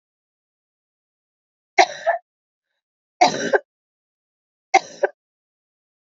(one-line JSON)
{"three_cough_length": "6.1 s", "three_cough_amplitude": 29127, "three_cough_signal_mean_std_ratio": 0.23, "survey_phase": "beta (2021-08-13 to 2022-03-07)", "age": "45-64", "gender": "Female", "wearing_mask": "No", "symptom_cough_any": true, "symptom_runny_or_blocked_nose": true, "symptom_sore_throat": true, "symptom_fatigue": true, "symptom_onset": "4 days", "smoker_status": "Never smoked", "respiratory_condition_asthma": false, "respiratory_condition_other": false, "recruitment_source": "Test and Trace", "submission_delay": "2 days", "covid_test_result": "Positive", "covid_test_method": "ePCR"}